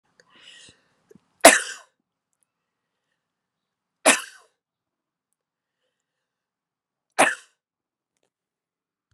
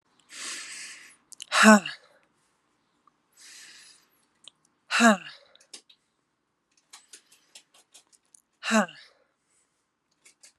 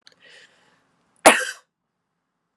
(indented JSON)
{
  "three_cough_length": "9.1 s",
  "three_cough_amplitude": 32768,
  "three_cough_signal_mean_std_ratio": 0.15,
  "exhalation_length": "10.6 s",
  "exhalation_amplitude": 31346,
  "exhalation_signal_mean_std_ratio": 0.21,
  "cough_length": "2.6 s",
  "cough_amplitude": 32768,
  "cough_signal_mean_std_ratio": 0.19,
  "survey_phase": "beta (2021-08-13 to 2022-03-07)",
  "age": "18-44",
  "gender": "Female",
  "wearing_mask": "No",
  "symptom_cough_any": true,
  "symptom_runny_or_blocked_nose": true,
  "symptom_fever_high_temperature": true,
  "symptom_change_to_sense_of_smell_or_taste": true,
  "symptom_loss_of_taste": true,
  "symptom_other": true,
  "symptom_onset": "4 days",
  "smoker_status": "Never smoked",
  "respiratory_condition_asthma": false,
  "respiratory_condition_other": false,
  "recruitment_source": "Test and Trace",
  "submission_delay": "0 days",
  "covid_test_result": "Positive",
  "covid_test_method": "RT-qPCR",
  "covid_ct_value": 19.2,
  "covid_ct_gene": "ORF1ab gene"
}